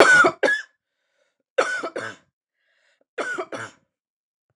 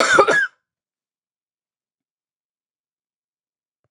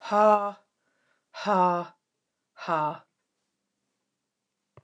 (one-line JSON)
{"three_cough_length": "4.6 s", "three_cough_amplitude": 29204, "three_cough_signal_mean_std_ratio": 0.36, "cough_length": "3.9 s", "cough_amplitude": 29203, "cough_signal_mean_std_ratio": 0.27, "exhalation_length": "4.8 s", "exhalation_amplitude": 12965, "exhalation_signal_mean_std_ratio": 0.35, "survey_phase": "beta (2021-08-13 to 2022-03-07)", "age": "45-64", "gender": "Female", "wearing_mask": "No", "symptom_none": true, "smoker_status": "Never smoked", "respiratory_condition_asthma": false, "respiratory_condition_other": false, "recruitment_source": "REACT", "submission_delay": "3 days", "covid_test_result": "Negative", "covid_test_method": "RT-qPCR", "influenza_a_test_result": "Negative", "influenza_b_test_result": "Negative"}